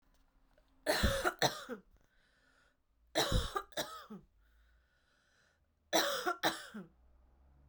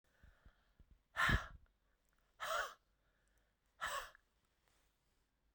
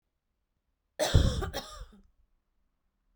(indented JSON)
{
  "three_cough_length": "7.7 s",
  "three_cough_amplitude": 6555,
  "three_cough_signal_mean_std_ratio": 0.4,
  "exhalation_length": "5.5 s",
  "exhalation_amplitude": 2494,
  "exhalation_signal_mean_std_ratio": 0.3,
  "cough_length": "3.2 s",
  "cough_amplitude": 13186,
  "cough_signal_mean_std_ratio": 0.3,
  "survey_phase": "beta (2021-08-13 to 2022-03-07)",
  "age": "45-64",
  "gender": "Female",
  "wearing_mask": "No",
  "symptom_runny_or_blocked_nose": true,
  "symptom_fatigue": true,
  "symptom_headache": true,
  "smoker_status": "Ex-smoker",
  "respiratory_condition_asthma": false,
  "respiratory_condition_other": false,
  "recruitment_source": "Test and Trace",
  "submission_delay": "1 day",
  "covid_test_result": "Positive",
  "covid_test_method": "RT-qPCR",
  "covid_ct_value": 23.6,
  "covid_ct_gene": "ORF1ab gene"
}